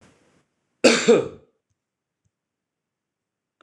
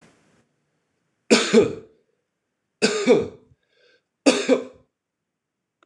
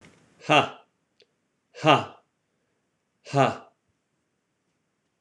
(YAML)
cough_length: 3.6 s
cough_amplitude: 26020
cough_signal_mean_std_ratio: 0.25
three_cough_length: 5.9 s
three_cough_amplitude: 26011
three_cough_signal_mean_std_ratio: 0.33
exhalation_length: 5.2 s
exhalation_amplitude: 24860
exhalation_signal_mean_std_ratio: 0.25
survey_phase: beta (2021-08-13 to 2022-03-07)
age: 45-64
gender: Male
wearing_mask: 'No'
symptom_none: true
smoker_status: Ex-smoker
respiratory_condition_asthma: true
respiratory_condition_other: false
recruitment_source: REACT
submission_delay: 3 days
covid_test_result: Negative
covid_test_method: RT-qPCR